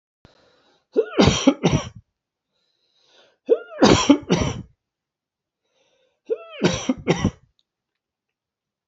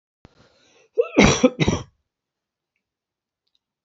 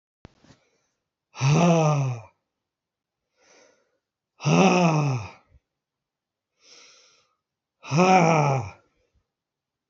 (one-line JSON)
{"three_cough_length": "8.9 s", "three_cough_amplitude": 27255, "three_cough_signal_mean_std_ratio": 0.34, "cough_length": "3.8 s", "cough_amplitude": 29818, "cough_signal_mean_std_ratio": 0.28, "exhalation_length": "9.9 s", "exhalation_amplitude": 19117, "exhalation_signal_mean_std_ratio": 0.4, "survey_phase": "beta (2021-08-13 to 2022-03-07)", "age": "65+", "gender": "Male", "wearing_mask": "No", "symptom_cough_any": true, "symptom_shortness_of_breath": true, "symptom_onset": "3 days", "smoker_status": "Never smoked", "respiratory_condition_asthma": false, "respiratory_condition_other": false, "recruitment_source": "Test and Trace", "submission_delay": "2 days", "covid_test_result": "Positive", "covid_test_method": "RT-qPCR", "covid_ct_value": 23.5, "covid_ct_gene": "ORF1ab gene", "covid_ct_mean": 23.8, "covid_viral_load": "16000 copies/ml", "covid_viral_load_category": "Low viral load (10K-1M copies/ml)"}